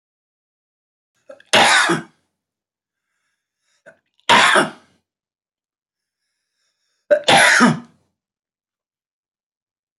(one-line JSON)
{"three_cough_length": "10.0 s", "three_cough_amplitude": 30420, "three_cough_signal_mean_std_ratio": 0.31, "survey_phase": "beta (2021-08-13 to 2022-03-07)", "age": "65+", "gender": "Male", "wearing_mask": "No", "symptom_cough_any": true, "smoker_status": "Never smoked", "recruitment_source": "REACT", "submission_delay": "2 days", "covid_test_result": "Negative", "covid_test_method": "RT-qPCR", "influenza_a_test_result": "Negative", "influenza_b_test_result": "Negative"}